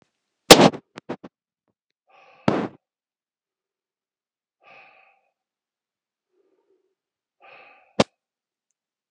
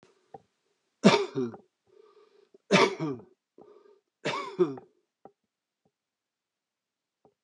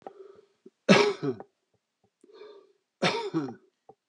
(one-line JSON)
{"exhalation_length": "9.1 s", "exhalation_amplitude": 32768, "exhalation_signal_mean_std_ratio": 0.14, "three_cough_length": "7.4 s", "three_cough_amplitude": 20185, "three_cough_signal_mean_std_ratio": 0.27, "cough_length": "4.1 s", "cough_amplitude": 20895, "cough_signal_mean_std_ratio": 0.33, "survey_phase": "alpha (2021-03-01 to 2021-08-12)", "age": "65+", "gender": "Male", "wearing_mask": "No", "symptom_none": true, "smoker_status": "Ex-smoker", "respiratory_condition_asthma": false, "respiratory_condition_other": true, "recruitment_source": "REACT", "submission_delay": "3 days", "covid_test_result": "Negative", "covid_test_method": "RT-qPCR"}